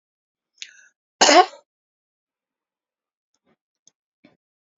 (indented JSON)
{
  "cough_length": "4.8 s",
  "cough_amplitude": 28871,
  "cough_signal_mean_std_ratio": 0.18,
  "survey_phase": "beta (2021-08-13 to 2022-03-07)",
  "age": "65+",
  "gender": "Female",
  "wearing_mask": "No",
  "symptom_none": true,
  "smoker_status": "Never smoked",
  "respiratory_condition_asthma": true,
  "respiratory_condition_other": false,
  "recruitment_source": "REACT",
  "submission_delay": "4 days",
  "covid_test_result": "Negative",
  "covid_test_method": "RT-qPCR",
  "influenza_a_test_result": "Negative",
  "influenza_b_test_result": "Negative"
}